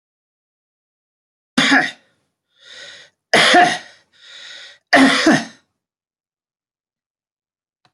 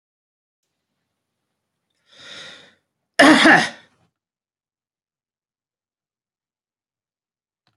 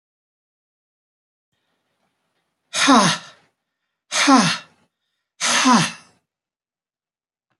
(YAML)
three_cough_length: 7.9 s
three_cough_amplitude: 29085
three_cough_signal_mean_std_ratio: 0.33
cough_length: 7.8 s
cough_amplitude: 30863
cough_signal_mean_std_ratio: 0.2
exhalation_length: 7.6 s
exhalation_amplitude: 27465
exhalation_signal_mean_std_ratio: 0.33
survey_phase: beta (2021-08-13 to 2022-03-07)
age: 65+
gender: Male
wearing_mask: 'No'
symptom_runny_or_blocked_nose: true
smoker_status: Never smoked
respiratory_condition_asthma: false
respiratory_condition_other: false
recruitment_source: REACT
submission_delay: 1 day
covid_test_result: Negative
covid_test_method: RT-qPCR
influenza_a_test_result: Unknown/Void
influenza_b_test_result: Unknown/Void